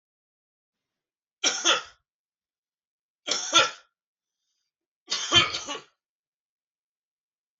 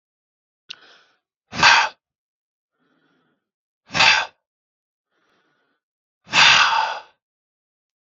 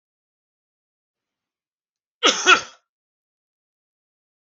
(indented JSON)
{
  "three_cough_length": "7.6 s",
  "three_cough_amplitude": 16470,
  "three_cough_signal_mean_std_ratio": 0.28,
  "exhalation_length": "8.0 s",
  "exhalation_amplitude": 32768,
  "exhalation_signal_mean_std_ratio": 0.3,
  "cough_length": "4.4 s",
  "cough_amplitude": 32766,
  "cough_signal_mean_std_ratio": 0.19,
  "survey_phase": "beta (2021-08-13 to 2022-03-07)",
  "age": "45-64",
  "gender": "Male",
  "wearing_mask": "No",
  "symptom_none": true,
  "smoker_status": "Never smoked",
  "respiratory_condition_asthma": false,
  "respiratory_condition_other": false,
  "recruitment_source": "REACT",
  "submission_delay": "5 days",
  "covid_test_result": "Negative",
  "covid_test_method": "RT-qPCR",
  "influenza_a_test_result": "Negative",
  "influenza_b_test_result": "Negative"
}